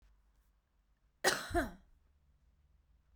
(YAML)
cough_length: 3.2 s
cough_amplitude: 5267
cough_signal_mean_std_ratio: 0.28
survey_phase: beta (2021-08-13 to 2022-03-07)
age: 45-64
gender: Female
wearing_mask: 'No'
symptom_none: true
smoker_status: Ex-smoker
respiratory_condition_asthma: false
respiratory_condition_other: false
recruitment_source: REACT
submission_delay: 4 days
covid_test_result: Negative
covid_test_method: RT-qPCR